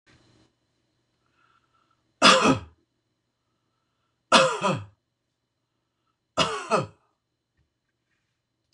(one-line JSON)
{"three_cough_length": "8.7 s", "three_cough_amplitude": 25743, "three_cough_signal_mean_std_ratio": 0.26, "survey_phase": "beta (2021-08-13 to 2022-03-07)", "age": "65+", "gender": "Male", "wearing_mask": "No", "symptom_none": true, "smoker_status": "Never smoked", "respiratory_condition_asthma": false, "respiratory_condition_other": false, "recruitment_source": "REACT", "submission_delay": "1 day", "covid_test_result": "Negative", "covid_test_method": "RT-qPCR"}